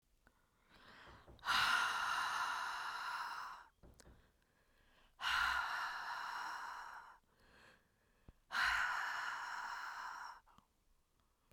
{"exhalation_length": "11.5 s", "exhalation_amplitude": 2216, "exhalation_signal_mean_std_ratio": 0.6, "survey_phase": "beta (2021-08-13 to 2022-03-07)", "age": "45-64", "gender": "Female", "wearing_mask": "Yes", "symptom_none": true, "smoker_status": "Never smoked", "respiratory_condition_asthma": true, "respiratory_condition_other": false, "recruitment_source": "REACT", "submission_delay": "8 days", "covid_test_result": "Negative", "covid_test_method": "RT-qPCR"}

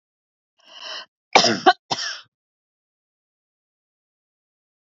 {"cough_length": "4.9 s", "cough_amplitude": 28639, "cough_signal_mean_std_ratio": 0.22, "survey_phase": "beta (2021-08-13 to 2022-03-07)", "age": "65+", "gender": "Female", "wearing_mask": "No", "symptom_none": true, "smoker_status": "Ex-smoker", "respiratory_condition_asthma": false, "respiratory_condition_other": false, "recruitment_source": "REACT", "submission_delay": "0 days", "covid_test_result": "Negative", "covid_test_method": "RT-qPCR", "influenza_a_test_result": "Negative", "influenza_b_test_result": "Negative"}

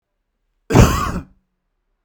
{"cough_length": "2.0 s", "cough_amplitude": 32768, "cough_signal_mean_std_ratio": 0.34, "survey_phase": "beta (2021-08-13 to 2022-03-07)", "age": "45-64", "gender": "Male", "wearing_mask": "No", "symptom_none": true, "smoker_status": "Never smoked", "respiratory_condition_asthma": false, "respiratory_condition_other": false, "recruitment_source": "REACT", "submission_delay": "1 day", "covid_test_result": "Negative", "covid_test_method": "RT-qPCR"}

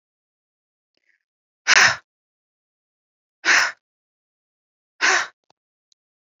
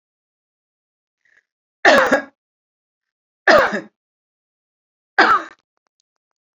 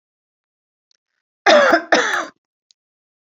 {"exhalation_length": "6.4 s", "exhalation_amplitude": 27120, "exhalation_signal_mean_std_ratio": 0.26, "three_cough_length": "6.6 s", "three_cough_amplitude": 28504, "three_cough_signal_mean_std_ratio": 0.29, "cough_length": "3.2 s", "cough_amplitude": 32768, "cough_signal_mean_std_ratio": 0.36, "survey_phase": "beta (2021-08-13 to 2022-03-07)", "age": "65+", "gender": "Female", "wearing_mask": "No", "symptom_none": true, "smoker_status": "Never smoked", "respiratory_condition_asthma": false, "respiratory_condition_other": false, "recruitment_source": "REACT", "submission_delay": "1 day", "covid_test_result": "Negative", "covid_test_method": "RT-qPCR", "influenza_a_test_result": "Negative", "influenza_b_test_result": "Negative"}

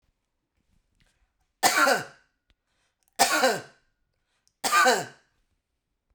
{"cough_length": "6.1 s", "cough_amplitude": 17589, "cough_signal_mean_std_ratio": 0.35, "survey_phase": "beta (2021-08-13 to 2022-03-07)", "age": "45-64", "gender": "Female", "wearing_mask": "No", "symptom_none": true, "smoker_status": "Ex-smoker", "respiratory_condition_asthma": false, "respiratory_condition_other": false, "recruitment_source": "REACT", "submission_delay": "1 day", "covid_test_result": "Negative", "covid_test_method": "RT-qPCR"}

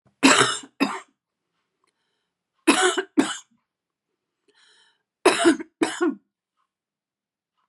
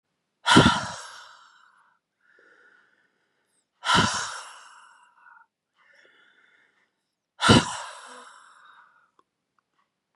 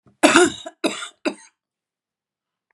{"three_cough_length": "7.7 s", "three_cough_amplitude": 28191, "three_cough_signal_mean_std_ratio": 0.33, "exhalation_length": "10.2 s", "exhalation_amplitude": 29747, "exhalation_signal_mean_std_ratio": 0.26, "cough_length": "2.7 s", "cough_amplitude": 32767, "cough_signal_mean_std_ratio": 0.32, "survey_phase": "beta (2021-08-13 to 2022-03-07)", "age": "65+", "gender": "Female", "wearing_mask": "No", "symptom_cough_any": true, "smoker_status": "Ex-smoker", "respiratory_condition_asthma": false, "respiratory_condition_other": false, "recruitment_source": "REACT", "submission_delay": "3 days", "covid_test_result": "Negative", "covid_test_method": "RT-qPCR"}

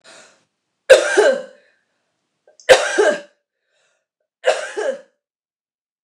{"three_cough_length": "6.0 s", "three_cough_amplitude": 29204, "three_cough_signal_mean_std_ratio": 0.33, "survey_phase": "beta (2021-08-13 to 2022-03-07)", "age": "45-64", "gender": "Female", "wearing_mask": "No", "symptom_runny_or_blocked_nose": true, "symptom_loss_of_taste": true, "smoker_status": "Never smoked", "respiratory_condition_asthma": true, "respiratory_condition_other": false, "recruitment_source": "Test and Trace", "submission_delay": "1 day", "covid_test_result": "Positive", "covid_test_method": "RT-qPCR", "covid_ct_value": 17.7, "covid_ct_gene": "ORF1ab gene", "covid_ct_mean": 18.3, "covid_viral_load": "970000 copies/ml", "covid_viral_load_category": "Low viral load (10K-1M copies/ml)"}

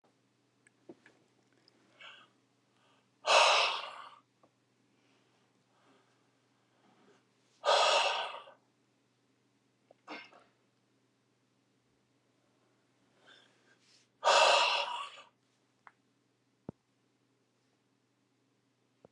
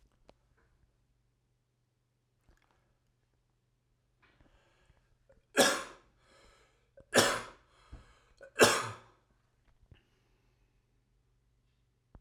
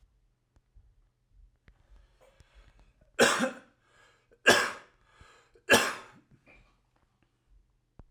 {"exhalation_length": "19.1 s", "exhalation_amplitude": 8802, "exhalation_signal_mean_std_ratio": 0.26, "three_cough_length": "12.2 s", "three_cough_amplitude": 13334, "three_cough_signal_mean_std_ratio": 0.2, "cough_length": "8.1 s", "cough_amplitude": 15717, "cough_signal_mean_std_ratio": 0.25, "survey_phase": "alpha (2021-03-01 to 2021-08-12)", "age": "45-64", "gender": "Male", "wearing_mask": "No", "symptom_fatigue": true, "symptom_headache": true, "smoker_status": "Ex-smoker", "respiratory_condition_asthma": false, "respiratory_condition_other": false, "recruitment_source": "Test and Trace", "submission_delay": "1 day", "covid_test_result": "Positive", "covid_test_method": "RT-qPCR", "covid_ct_value": 27.1, "covid_ct_gene": "ORF1ab gene"}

